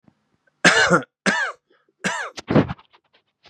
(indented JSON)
{
  "three_cough_length": "3.5 s",
  "three_cough_amplitude": 32767,
  "three_cough_signal_mean_std_ratio": 0.4,
  "survey_phase": "beta (2021-08-13 to 2022-03-07)",
  "age": "18-44",
  "gender": "Male",
  "wearing_mask": "No",
  "symptom_diarrhoea": true,
  "symptom_fatigue": true,
  "smoker_status": "Ex-smoker",
  "respiratory_condition_asthma": true,
  "respiratory_condition_other": false,
  "recruitment_source": "Test and Trace",
  "submission_delay": "5 days",
  "covid_test_result": "Negative",
  "covid_test_method": "LFT"
}